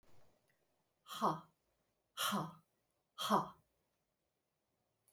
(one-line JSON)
{"exhalation_length": "5.1 s", "exhalation_amplitude": 3878, "exhalation_signal_mean_std_ratio": 0.32, "survey_phase": "beta (2021-08-13 to 2022-03-07)", "age": "45-64", "gender": "Female", "wearing_mask": "No", "symptom_none": true, "smoker_status": "Never smoked", "respiratory_condition_asthma": false, "respiratory_condition_other": false, "recruitment_source": "REACT", "submission_delay": "6 days", "covid_test_result": "Negative", "covid_test_method": "RT-qPCR"}